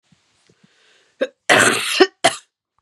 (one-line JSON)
{"cough_length": "2.8 s", "cough_amplitude": 32767, "cough_signal_mean_std_ratio": 0.36, "survey_phase": "beta (2021-08-13 to 2022-03-07)", "age": "45-64", "gender": "Female", "wearing_mask": "No", "symptom_cough_any": true, "symptom_headache": true, "smoker_status": "Never smoked", "respiratory_condition_asthma": false, "respiratory_condition_other": false, "recruitment_source": "REACT", "submission_delay": "1 day", "covid_test_result": "Negative", "covid_test_method": "RT-qPCR", "influenza_a_test_result": "Negative", "influenza_b_test_result": "Negative"}